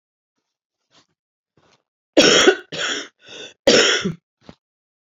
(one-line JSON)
{"three_cough_length": "5.1 s", "three_cough_amplitude": 32454, "three_cough_signal_mean_std_ratio": 0.35, "survey_phase": "beta (2021-08-13 to 2022-03-07)", "age": "45-64", "gender": "Female", "wearing_mask": "No", "symptom_cough_any": true, "smoker_status": "Never smoked", "respiratory_condition_asthma": true, "respiratory_condition_other": false, "recruitment_source": "REACT", "submission_delay": "2 days", "covid_test_result": "Negative", "covid_test_method": "RT-qPCR", "influenza_a_test_result": "Negative", "influenza_b_test_result": "Negative"}